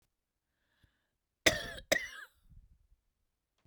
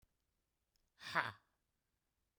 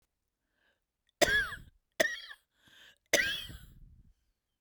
{
  "cough_length": "3.7 s",
  "cough_amplitude": 13687,
  "cough_signal_mean_std_ratio": 0.22,
  "exhalation_length": "2.4 s",
  "exhalation_amplitude": 3332,
  "exhalation_signal_mean_std_ratio": 0.21,
  "three_cough_length": "4.6 s",
  "three_cough_amplitude": 11415,
  "three_cough_signal_mean_std_ratio": 0.32,
  "survey_phase": "beta (2021-08-13 to 2022-03-07)",
  "age": "18-44",
  "gender": "Female",
  "wearing_mask": "No",
  "symptom_cough_any": true,
  "symptom_sore_throat": true,
  "symptom_fatigue": true,
  "symptom_headache": true,
  "symptom_onset": "9 days",
  "smoker_status": "Ex-smoker",
  "respiratory_condition_asthma": false,
  "respiratory_condition_other": false,
  "recruitment_source": "REACT",
  "submission_delay": "1 day",
  "covid_test_result": "Negative",
  "covid_test_method": "RT-qPCR",
  "influenza_a_test_result": "Unknown/Void",
  "influenza_b_test_result": "Unknown/Void"
}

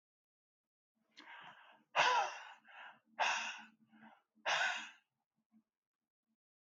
{
  "exhalation_length": "6.7 s",
  "exhalation_amplitude": 3527,
  "exhalation_signal_mean_std_ratio": 0.35,
  "survey_phase": "alpha (2021-03-01 to 2021-08-12)",
  "age": "65+",
  "gender": "Male",
  "wearing_mask": "No",
  "symptom_none": true,
  "smoker_status": "Never smoked",
  "respiratory_condition_asthma": false,
  "respiratory_condition_other": false,
  "recruitment_source": "REACT",
  "submission_delay": "1 day",
  "covid_test_result": "Negative",
  "covid_test_method": "RT-qPCR"
}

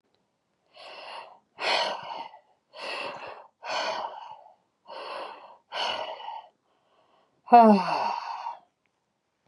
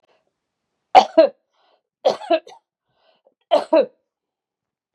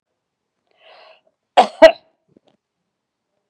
{
  "exhalation_length": "9.5 s",
  "exhalation_amplitude": 21185,
  "exhalation_signal_mean_std_ratio": 0.34,
  "three_cough_length": "4.9 s",
  "three_cough_amplitude": 32768,
  "three_cough_signal_mean_std_ratio": 0.27,
  "cough_length": "3.5 s",
  "cough_amplitude": 32768,
  "cough_signal_mean_std_ratio": 0.18,
  "survey_phase": "beta (2021-08-13 to 2022-03-07)",
  "age": "45-64",
  "gender": "Female",
  "wearing_mask": "No",
  "symptom_none": true,
  "smoker_status": "Ex-smoker",
  "respiratory_condition_asthma": false,
  "respiratory_condition_other": false,
  "recruitment_source": "REACT",
  "submission_delay": "2 days",
  "covid_test_result": "Negative",
  "covid_test_method": "RT-qPCR",
  "influenza_a_test_result": "Negative",
  "influenza_b_test_result": "Negative"
}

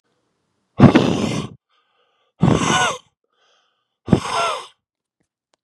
{
  "exhalation_length": "5.6 s",
  "exhalation_amplitude": 32768,
  "exhalation_signal_mean_std_ratio": 0.37,
  "survey_phase": "beta (2021-08-13 to 2022-03-07)",
  "age": "18-44",
  "gender": "Male",
  "wearing_mask": "No",
  "symptom_cough_any": true,
  "symptom_new_continuous_cough": true,
  "symptom_runny_or_blocked_nose": true,
  "symptom_sore_throat": true,
  "symptom_fever_high_temperature": true,
  "symptom_onset": "5 days",
  "smoker_status": "Never smoked",
  "respiratory_condition_asthma": false,
  "respiratory_condition_other": false,
  "recruitment_source": "Test and Trace",
  "submission_delay": "3 days",
  "covid_test_result": "Positive",
  "covid_test_method": "RT-qPCR",
  "covid_ct_value": 18.3,
  "covid_ct_gene": "N gene"
}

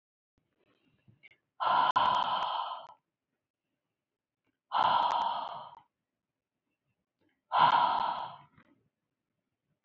{
  "exhalation_length": "9.8 s",
  "exhalation_amplitude": 8394,
  "exhalation_signal_mean_std_ratio": 0.42,
  "survey_phase": "beta (2021-08-13 to 2022-03-07)",
  "age": "45-64",
  "gender": "Female",
  "wearing_mask": "No",
  "symptom_none": true,
  "smoker_status": "Never smoked",
  "respiratory_condition_asthma": false,
  "respiratory_condition_other": false,
  "recruitment_source": "REACT",
  "submission_delay": "1 day",
  "covid_test_result": "Negative",
  "covid_test_method": "RT-qPCR",
  "influenza_a_test_result": "Negative",
  "influenza_b_test_result": "Negative"
}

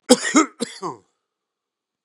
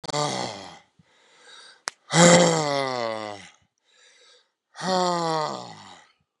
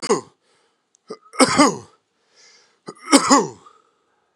{
  "cough_length": "2.0 s",
  "cough_amplitude": 32767,
  "cough_signal_mean_std_ratio": 0.3,
  "exhalation_length": "6.4 s",
  "exhalation_amplitude": 32662,
  "exhalation_signal_mean_std_ratio": 0.4,
  "three_cough_length": "4.4 s",
  "three_cough_amplitude": 32767,
  "three_cough_signal_mean_std_ratio": 0.33,
  "survey_phase": "beta (2021-08-13 to 2022-03-07)",
  "age": "45-64",
  "gender": "Male",
  "wearing_mask": "Yes",
  "symptom_cough_any": true,
  "symptom_shortness_of_breath": true,
  "symptom_fatigue": true,
  "symptom_headache": true,
  "symptom_change_to_sense_of_smell_or_taste": true,
  "symptom_onset": "2 days",
  "smoker_status": "Ex-smoker",
  "respiratory_condition_asthma": true,
  "respiratory_condition_other": false,
  "recruitment_source": "Test and Trace",
  "submission_delay": "2 days",
  "covid_test_result": "Positive",
  "covid_test_method": "RT-qPCR",
  "covid_ct_value": 17.9,
  "covid_ct_gene": "N gene"
}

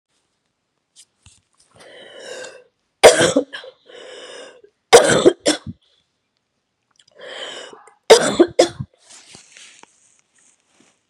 {
  "three_cough_length": "11.1 s",
  "three_cough_amplitude": 32768,
  "three_cough_signal_mean_std_ratio": 0.27,
  "survey_phase": "beta (2021-08-13 to 2022-03-07)",
  "age": "45-64",
  "gender": "Female",
  "wearing_mask": "No",
  "symptom_cough_any": true,
  "symptom_runny_or_blocked_nose": true,
  "symptom_sore_throat": true,
  "symptom_fatigue": true,
  "symptom_headache": true,
  "symptom_change_to_sense_of_smell_or_taste": true,
  "symptom_loss_of_taste": true,
  "symptom_onset": "2 days",
  "smoker_status": "Never smoked",
  "respiratory_condition_asthma": false,
  "respiratory_condition_other": false,
  "recruitment_source": "Test and Trace",
  "submission_delay": "2 days",
  "covid_test_result": "Positive",
  "covid_test_method": "RT-qPCR",
  "covid_ct_value": 26.3,
  "covid_ct_gene": "ORF1ab gene"
}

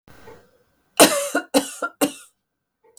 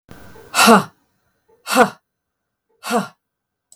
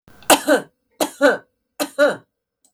{
  "cough_length": "3.0 s",
  "cough_amplitude": 32768,
  "cough_signal_mean_std_ratio": 0.32,
  "exhalation_length": "3.8 s",
  "exhalation_amplitude": 32768,
  "exhalation_signal_mean_std_ratio": 0.32,
  "three_cough_length": "2.7 s",
  "three_cough_amplitude": 32768,
  "three_cough_signal_mean_std_ratio": 0.4,
  "survey_phase": "beta (2021-08-13 to 2022-03-07)",
  "age": "45-64",
  "gender": "Female",
  "wearing_mask": "No",
  "symptom_cough_any": true,
  "symptom_onset": "2 days",
  "smoker_status": "Never smoked",
  "respiratory_condition_asthma": false,
  "respiratory_condition_other": false,
  "recruitment_source": "Test and Trace",
  "submission_delay": "0 days",
  "covid_test_result": "Positive",
  "covid_test_method": "RT-qPCR",
  "covid_ct_value": 30.9,
  "covid_ct_gene": "ORF1ab gene"
}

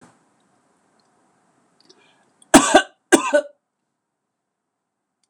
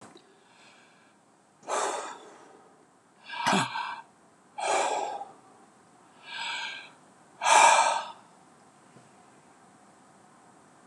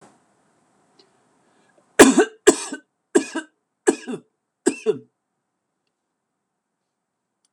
{
  "cough_length": "5.3 s",
  "cough_amplitude": 26028,
  "cough_signal_mean_std_ratio": 0.22,
  "exhalation_length": "10.9 s",
  "exhalation_amplitude": 16684,
  "exhalation_signal_mean_std_ratio": 0.37,
  "three_cough_length": "7.5 s",
  "three_cough_amplitude": 26028,
  "three_cough_signal_mean_std_ratio": 0.23,
  "survey_phase": "beta (2021-08-13 to 2022-03-07)",
  "age": "45-64",
  "gender": "Male",
  "wearing_mask": "No",
  "symptom_none": true,
  "smoker_status": "Never smoked",
  "respiratory_condition_asthma": false,
  "respiratory_condition_other": false,
  "recruitment_source": "REACT",
  "submission_delay": "4 days",
  "covid_test_result": "Negative",
  "covid_test_method": "RT-qPCR",
  "influenza_a_test_result": "Negative",
  "influenza_b_test_result": "Negative"
}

